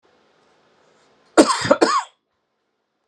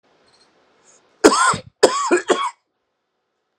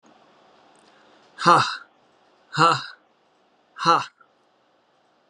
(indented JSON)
{
  "cough_length": "3.1 s",
  "cough_amplitude": 32768,
  "cough_signal_mean_std_ratio": 0.3,
  "three_cough_length": "3.6 s",
  "three_cough_amplitude": 32768,
  "three_cough_signal_mean_std_ratio": 0.36,
  "exhalation_length": "5.3 s",
  "exhalation_amplitude": 27443,
  "exhalation_signal_mean_std_ratio": 0.29,
  "survey_phase": "beta (2021-08-13 to 2022-03-07)",
  "age": "45-64",
  "gender": "Male",
  "wearing_mask": "No",
  "symptom_cough_any": true,
  "symptom_new_continuous_cough": true,
  "symptom_fatigue": true,
  "smoker_status": "Never smoked",
  "respiratory_condition_asthma": false,
  "respiratory_condition_other": false,
  "recruitment_source": "Test and Trace",
  "submission_delay": "2 days",
  "covid_test_result": "Positive",
  "covid_test_method": "RT-qPCR",
  "covid_ct_value": 27.6,
  "covid_ct_gene": "N gene"
}